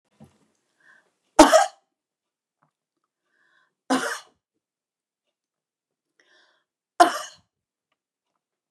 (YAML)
three_cough_length: 8.7 s
three_cough_amplitude: 29204
three_cough_signal_mean_std_ratio: 0.18
survey_phase: beta (2021-08-13 to 2022-03-07)
age: 65+
gender: Female
wearing_mask: 'No'
symptom_runny_or_blocked_nose: true
symptom_headache: true
symptom_onset: 13 days
smoker_status: Never smoked
respiratory_condition_asthma: false
respiratory_condition_other: false
recruitment_source: REACT
submission_delay: 1 day
covid_test_result: Negative
covid_test_method: RT-qPCR
influenza_a_test_result: Unknown/Void
influenza_b_test_result: Unknown/Void